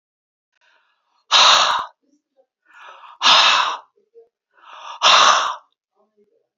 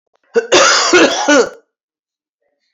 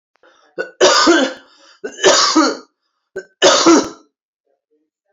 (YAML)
exhalation_length: 6.6 s
exhalation_amplitude: 31647
exhalation_signal_mean_std_ratio: 0.4
cough_length: 2.7 s
cough_amplitude: 31742
cough_signal_mean_std_ratio: 0.53
three_cough_length: 5.1 s
three_cough_amplitude: 32768
three_cough_signal_mean_std_ratio: 0.47
survey_phase: beta (2021-08-13 to 2022-03-07)
age: 65+
gender: Female
wearing_mask: 'No'
symptom_cough_any: true
symptom_runny_or_blocked_nose: true
symptom_shortness_of_breath: true
symptom_sore_throat: true
symptom_fatigue: true
symptom_headache: true
symptom_change_to_sense_of_smell_or_taste: true
symptom_loss_of_taste: true
symptom_onset: 10 days
smoker_status: Ex-smoker
respiratory_condition_asthma: false
respiratory_condition_other: false
recruitment_source: Test and Trace
submission_delay: 3 days
covid_test_result: Positive
covid_test_method: ePCR